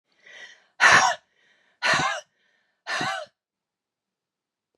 {
  "exhalation_length": "4.8 s",
  "exhalation_amplitude": 21889,
  "exhalation_signal_mean_std_ratio": 0.34,
  "survey_phase": "beta (2021-08-13 to 2022-03-07)",
  "age": "65+",
  "gender": "Female",
  "wearing_mask": "No",
  "symptom_none": true,
  "smoker_status": "Ex-smoker",
  "respiratory_condition_asthma": false,
  "respiratory_condition_other": false,
  "recruitment_source": "REACT",
  "submission_delay": "3 days",
  "covid_test_result": "Negative",
  "covid_test_method": "RT-qPCR",
  "influenza_a_test_result": "Negative",
  "influenza_b_test_result": "Negative"
}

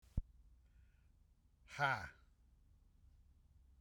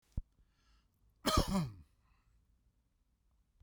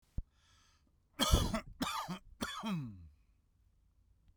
{
  "exhalation_length": "3.8 s",
  "exhalation_amplitude": 2327,
  "exhalation_signal_mean_std_ratio": 0.29,
  "cough_length": "3.6 s",
  "cough_amplitude": 4556,
  "cough_signal_mean_std_ratio": 0.3,
  "three_cough_length": "4.4 s",
  "three_cough_amplitude": 7178,
  "three_cough_signal_mean_std_ratio": 0.41,
  "survey_phase": "beta (2021-08-13 to 2022-03-07)",
  "age": "45-64",
  "gender": "Male",
  "wearing_mask": "No",
  "symptom_none": true,
  "smoker_status": "Ex-smoker",
  "respiratory_condition_asthma": false,
  "respiratory_condition_other": false,
  "recruitment_source": "REACT",
  "submission_delay": "1 day",
  "covid_test_result": "Negative",
  "covid_test_method": "RT-qPCR"
}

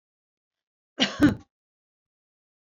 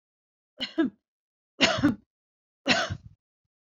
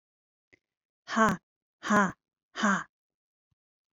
{
  "cough_length": "2.7 s",
  "cough_amplitude": 13645,
  "cough_signal_mean_std_ratio": 0.23,
  "three_cough_length": "3.8 s",
  "three_cough_amplitude": 19946,
  "three_cough_signal_mean_std_ratio": 0.35,
  "exhalation_length": "3.9 s",
  "exhalation_amplitude": 10828,
  "exhalation_signal_mean_std_ratio": 0.33,
  "survey_phase": "beta (2021-08-13 to 2022-03-07)",
  "age": "45-64",
  "gender": "Female",
  "wearing_mask": "No",
  "symptom_none": true,
  "smoker_status": "Never smoked",
  "respiratory_condition_asthma": false,
  "respiratory_condition_other": false,
  "recruitment_source": "REACT",
  "submission_delay": "2 days",
  "covid_test_result": "Negative",
  "covid_test_method": "RT-qPCR",
  "influenza_a_test_result": "Negative",
  "influenza_b_test_result": "Negative"
}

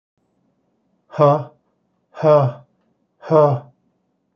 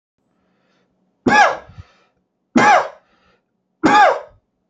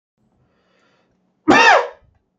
{
  "exhalation_length": "4.4 s",
  "exhalation_amplitude": 28133,
  "exhalation_signal_mean_std_ratio": 0.36,
  "three_cough_length": "4.7 s",
  "three_cough_amplitude": 28741,
  "three_cough_signal_mean_std_ratio": 0.38,
  "cough_length": "2.4 s",
  "cough_amplitude": 32260,
  "cough_signal_mean_std_ratio": 0.33,
  "survey_phase": "alpha (2021-03-01 to 2021-08-12)",
  "age": "45-64",
  "gender": "Male",
  "wearing_mask": "No",
  "symptom_none": true,
  "symptom_headache": true,
  "smoker_status": "Never smoked",
  "respiratory_condition_asthma": false,
  "respiratory_condition_other": false,
  "recruitment_source": "REACT",
  "submission_delay": "1 day",
  "covid_test_result": "Negative",
  "covid_test_method": "RT-qPCR"
}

